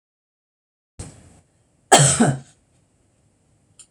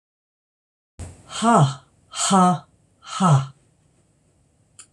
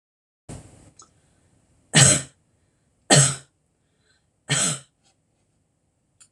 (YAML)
cough_length: 3.9 s
cough_amplitude: 26028
cough_signal_mean_std_ratio: 0.27
exhalation_length: 4.9 s
exhalation_amplitude: 23174
exhalation_signal_mean_std_ratio: 0.4
three_cough_length: 6.3 s
three_cough_amplitude: 25722
three_cough_signal_mean_std_ratio: 0.27
survey_phase: beta (2021-08-13 to 2022-03-07)
age: 65+
gender: Female
wearing_mask: 'No'
symptom_none: true
smoker_status: Never smoked
respiratory_condition_asthma: false
respiratory_condition_other: false
recruitment_source: REACT
submission_delay: 2 days
covid_test_result: Negative
covid_test_method: RT-qPCR
influenza_a_test_result: Negative
influenza_b_test_result: Negative